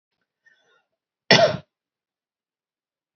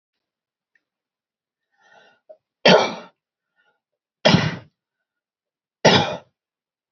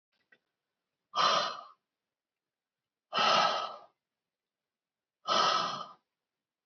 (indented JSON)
{
  "cough_length": "3.2 s",
  "cough_amplitude": 28096,
  "cough_signal_mean_std_ratio": 0.21,
  "three_cough_length": "6.9 s",
  "three_cough_amplitude": 29736,
  "three_cough_signal_mean_std_ratio": 0.26,
  "exhalation_length": "6.7 s",
  "exhalation_amplitude": 6314,
  "exhalation_signal_mean_std_ratio": 0.38,
  "survey_phase": "beta (2021-08-13 to 2022-03-07)",
  "age": "18-44",
  "gender": "Female",
  "wearing_mask": "No",
  "symptom_none": true,
  "smoker_status": "Never smoked",
  "respiratory_condition_asthma": false,
  "respiratory_condition_other": false,
  "recruitment_source": "REACT",
  "submission_delay": "1 day",
  "covid_test_result": "Negative",
  "covid_test_method": "RT-qPCR",
  "influenza_a_test_result": "Negative",
  "influenza_b_test_result": "Negative"
}